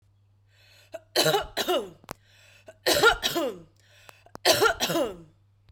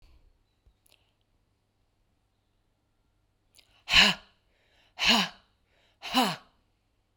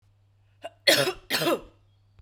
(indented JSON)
{
  "three_cough_length": "5.7 s",
  "three_cough_amplitude": 16182,
  "three_cough_signal_mean_std_ratio": 0.45,
  "exhalation_length": "7.2 s",
  "exhalation_amplitude": 17196,
  "exhalation_signal_mean_std_ratio": 0.25,
  "cough_length": "2.2 s",
  "cough_amplitude": 19501,
  "cough_signal_mean_std_ratio": 0.4,
  "survey_phase": "beta (2021-08-13 to 2022-03-07)",
  "age": "18-44",
  "gender": "Female",
  "wearing_mask": "No",
  "symptom_sore_throat": true,
  "symptom_fatigue": true,
  "symptom_headache": true,
  "symptom_onset": "3 days",
  "smoker_status": "Ex-smoker",
  "respiratory_condition_asthma": false,
  "respiratory_condition_other": false,
  "recruitment_source": "Test and Trace",
  "submission_delay": "1 day",
  "covid_test_result": "Positive",
  "covid_test_method": "RT-qPCR",
  "covid_ct_value": 12.1,
  "covid_ct_gene": "ORF1ab gene",
  "covid_ct_mean": 12.4,
  "covid_viral_load": "87000000 copies/ml",
  "covid_viral_load_category": "High viral load (>1M copies/ml)"
}